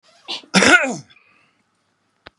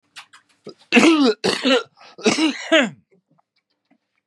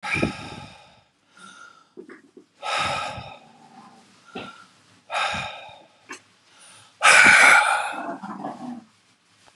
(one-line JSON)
{"cough_length": "2.4 s", "cough_amplitude": 32767, "cough_signal_mean_std_ratio": 0.33, "three_cough_length": "4.3 s", "three_cough_amplitude": 31520, "three_cough_signal_mean_std_ratio": 0.46, "exhalation_length": "9.6 s", "exhalation_amplitude": 29672, "exhalation_signal_mean_std_ratio": 0.37, "survey_phase": "beta (2021-08-13 to 2022-03-07)", "age": "45-64", "gender": "Male", "wearing_mask": "No", "symptom_shortness_of_breath": true, "smoker_status": "Ex-smoker", "respiratory_condition_asthma": false, "respiratory_condition_other": true, "recruitment_source": "REACT", "submission_delay": "4 days", "covid_test_result": "Negative", "covid_test_method": "RT-qPCR", "influenza_a_test_result": "Negative", "influenza_b_test_result": "Negative"}